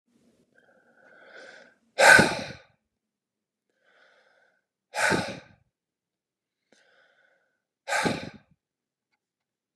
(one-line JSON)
{"exhalation_length": "9.8 s", "exhalation_amplitude": 25798, "exhalation_signal_mean_std_ratio": 0.23, "survey_phase": "beta (2021-08-13 to 2022-03-07)", "age": "18-44", "gender": "Male", "wearing_mask": "No", "symptom_cough_any": true, "symptom_runny_or_blocked_nose": true, "symptom_sore_throat": true, "symptom_onset": "3 days", "smoker_status": "Never smoked", "respiratory_condition_asthma": false, "respiratory_condition_other": false, "recruitment_source": "Test and Trace", "submission_delay": "2 days", "covid_test_result": "Positive", "covid_test_method": "RT-qPCR", "covid_ct_value": 29.0, "covid_ct_gene": "N gene", "covid_ct_mean": 29.0, "covid_viral_load": "300 copies/ml", "covid_viral_load_category": "Minimal viral load (< 10K copies/ml)"}